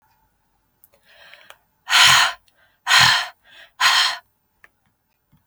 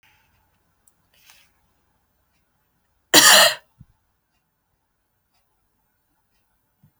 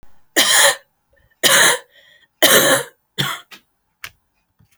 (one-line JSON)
{"exhalation_length": "5.5 s", "exhalation_amplitude": 32767, "exhalation_signal_mean_std_ratio": 0.37, "cough_length": "7.0 s", "cough_amplitude": 32768, "cough_signal_mean_std_ratio": 0.19, "three_cough_length": "4.8 s", "three_cough_amplitude": 32768, "three_cough_signal_mean_std_ratio": 0.43, "survey_phase": "beta (2021-08-13 to 2022-03-07)", "age": "45-64", "gender": "Female", "wearing_mask": "No", "symptom_cough_any": true, "symptom_runny_or_blocked_nose": true, "symptom_sore_throat": true, "symptom_diarrhoea": true, "symptom_fatigue": true, "symptom_fever_high_temperature": true, "symptom_headache": true, "symptom_onset": "4 days", "smoker_status": "Never smoked", "respiratory_condition_asthma": false, "respiratory_condition_other": false, "recruitment_source": "Test and Trace", "submission_delay": "2 days", "covid_test_result": "Positive", "covid_test_method": "RT-qPCR", "covid_ct_value": 15.3, "covid_ct_gene": "N gene", "covid_ct_mean": 16.4, "covid_viral_load": "4100000 copies/ml", "covid_viral_load_category": "High viral load (>1M copies/ml)"}